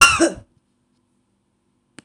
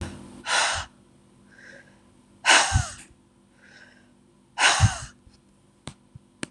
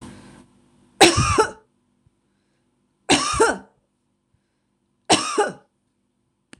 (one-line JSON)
{"cough_length": "2.0 s", "cough_amplitude": 26028, "cough_signal_mean_std_ratio": 0.28, "exhalation_length": "6.5 s", "exhalation_amplitude": 21426, "exhalation_signal_mean_std_ratio": 0.36, "three_cough_length": "6.6 s", "three_cough_amplitude": 26028, "three_cough_signal_mean_std_ratio": 0.33, "survey_phase": "beta (2021-08-13 to 2022-03-07)", "age": "65+", "gender": "Female", "wearing_mask": "No", "symptom_none": true, "smoker_status": "Ex-smoker", "respiratory_condition_asthma": false, "respiratory_condition_other": true, "recruitment_source": "REACT", "submission_delay": "4 days", "covid_test_result": "Negative", "covid_test_method": "RT-qPCR", "influenza_a_test_result": "Negative", "influenza_b_test_result": "Negative"}